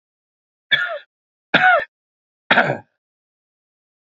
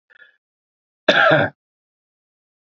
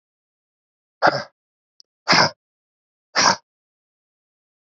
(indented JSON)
{
  "three_cough_length": "4.0 s",
  "three_cough_amplitude": 30421,
  "three_cough_signal_mean_std_ratio": 0.33,
  "cough_length": "2.7 s",
  "cough_amplitude": 28707,
  "cough_signal_mean_std_ratio": 0.31,
  "exhalation_length": "4.8 s",
  "exhalation_amplitude": 27121,
  "exhalation_signal_mean_std_ratio": 0.26,
  "survey_phase": "beta (2021-08-13 to 2022-03-07)",
  "age": "18-44",
  "gender": "Male",
  "wearing_mask": "No",
  "symptom_sore_throat": true,
  "smoker_status": "Never smoked",
  "respiratory_condition_asthma": false,
  "respiratory_condition_other": false,
  "recruitment_source": "Test and Trace",
  "submission_delay": "1 day",
  "covid_test_result": "Negative",
  "covid_test_method": "RT-qPCR"
}